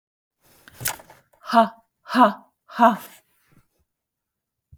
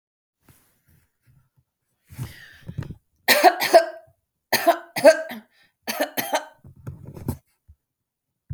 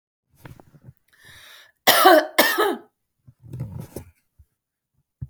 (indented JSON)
{
  "exhalation_length": "4.8 s",
  "exhalation_amplitude": 26668,
  "exhalation_signal_mean_std_ratio": 0.28,
  "three_cough_length": "8.5 s",
  "three_cough_amplitude": 30158,
  "three_cough_signal_mean_std_ratio": 0.29,
  "cough_length": "5.3 s",
  "cough_amplitude": 32768,
  "cough_signal_mean_std_ratio": 0.32,
  "survey_phase": "beta (2021-08-13 to 2022-03-07)",
  "age": "45-64",
  "gender": "Female",
  "wearing_mask": "No",
  "symptom_none": true,
  "smoker_status": "Never smoked",
  "respiratory_condition_asthma": false,
  "respiratory_condition_other": false,
  "recruitment_source": "REACT",
  "submission_delay": "4 days",
  "covid_test_result": "Negative",
  "covid_test_method": "RT-qPCR"
}